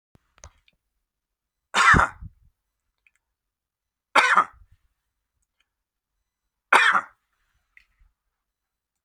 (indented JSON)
{
  "three_cough_length": "9.0 s",
  "three_cough_amplitude": 27432,
  "three_cough_signal_mean_std_ratio": 0.24,
  "survey_phase": "beta (2021-08-13 to 2022-03-07)",
  "age": "45-64",
  "gender": "Male",
  "wearing_mask": "No",
  "symptom_none": true,
  "smoker_status": "Never smoked",
  "respiratory_condition_asthma": false,
  "respiratory_condition_other": false,
  "recruitment_source": "REACT",
  "submission_delay": "3 days",
  "covid_test_result": "Negative",
  "covid_test_method": "RT-qPCR",
  "influenza_a_test_result": "Negative",
  "influenza_b_test_result": "Negative"
}